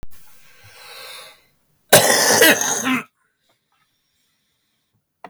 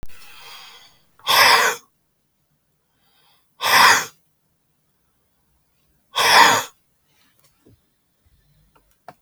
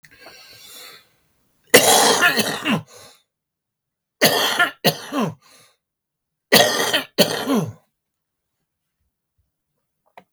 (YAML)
cough_length: 5.3 s
cough_amplitude: 32768
cough_signal_mean_std_ratio: 0.37
exhalation_length: 9.2 s
exhalation_amplitude: 32766
exhalation_signal_mean_std_ratio: 0.32
three_cough_length: 10.3 s
three_cough_amplitude: 32768
three_cough_signal_mean_std_ratio: 0.39
survey_phase: beta (2021-08-13 to 2022-03-07)
age: 65+
gender: Male
wearing_mask: 'No'
symptom_cough_any: true
symptom_runny_or_blocked_nose: true
smoker_status: Ex-smoker
respiratory_condition_asthma: true
respiratory_condition_other: true
recruitment_source: REACT
submission_delay: 2 days
covid_test_result: Negative
covid_test_method: RT-qPCR
influenza_a_test_result: Negative
influenza_b_test_result: Negative